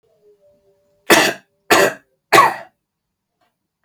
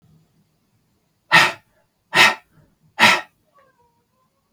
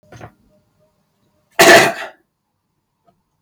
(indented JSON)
{
  "three_cough_length": "3.8 s",
  "three_cough_amplitude": 32768,
  "three_cough_signal_mean_std_ratio": 0.33,
  "exhalation_length": "4.5 s",
  "exhalation_amplitude": 32768,
  "exhalation_signal_mean_std_ratio": 0.28,
  "cough_length": "3.4 s",
  "cough_amplitude": 32768,
  "cough_signal_mean_std_ratio": 0.27,
  "survey_phase": "beta (2021-08-13 to 2022-03-07)",
  "age": "18-44",
  "gender": "Male",
  "wearing_mask": "No",
  "symptom_none": true,
  "smoker_status": "Never smoked",
  "respiratory_condition_asthma": false,
  "respiratory_condition_other": false,
  "recruitment_source": "Test and Trace",
  "submission_delay": "2 days",
  "covid_test_result": "Negative",
  "covid_test_method": "ePCR"
}